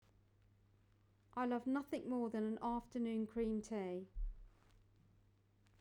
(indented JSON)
{
  "exhalation_length": "5.8 s",
  "exhalation_amplitude": 1151,
  "exhalation_signal_mean_std_ratio": 0.62,
  "survey_phase": "beta (2021-08-13 to 2022-03-07)",
  "age": "45-64",
  "gender": "Female",
  "wearing_mask": "No",
  "symptom_none": true,
  "smoker_status": "Never smoked",
  "respiratory_condition_asthma": false,
  "respiratory_condition_other": false,
  "recruitment_source": "REACT",
  "submission_delay": "2 days",
  "covid_test_result": "Negative",
  "covid_test_method": "RT-qPCR"
}